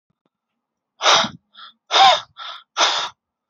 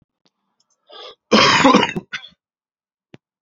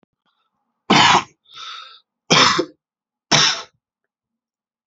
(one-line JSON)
{"exhalation_length": "3.5 s", "exhalation_amplitude": 30672, "exhalation_signal_mean_std_ratio": 0.39, "cough_length": "3.4 s", "cough_amplitude": 32767, "cough_signal_mean_std_ratio": 0.36, "three_cough_length": "4.9 s", "three_cough_amplitude": 30449, "three_cough_signal_mean_std_ratio": 0.36, "survey_phase": "alpha (2021-03-01 to 2021-08-12)", "age": "18-44", "gender": "Male", "wearing_mask": "No", "symptom_new_continuous_cough": true, "symptom_shortness_of_breath": true, "symptom_diarrhoea": true, "symptom_fatigue": true, "symptom_fever_high_temperature": true, "symptom_headache": true, "symptom_onset": "2 days", "smoker_status": "Never smoked", "respiratory_condition_asthma": false, "respiratory_condition_other": false, "recruitment_source": "Test and Trace", "submission_delay": "1 day", "covid_test_result": "Positive", "covid_test_method": "RT-qPCR"}